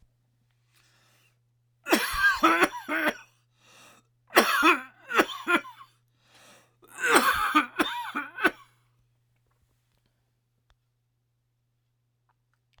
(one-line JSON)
{"cough_length": "12.8 s", "cough_amplitude": 29920, "cough_signal_mean_std_ratio": 0.37, "survey_phase": "alpha (2021-03-01 to 2021-08-12)", "age": "65+", "gender": "Male", "wearing_mask": "No", "symptom_cough_any": true, "smoker_status": "Ex-smoker", "respiratory_condition_asthma": false, "respiratory_condition_other": true, "recruitment_source": "REACT", "submission_delay": "2 days", "covid_test_result": "Negative", "covid_test_method": "RT-qPCR"}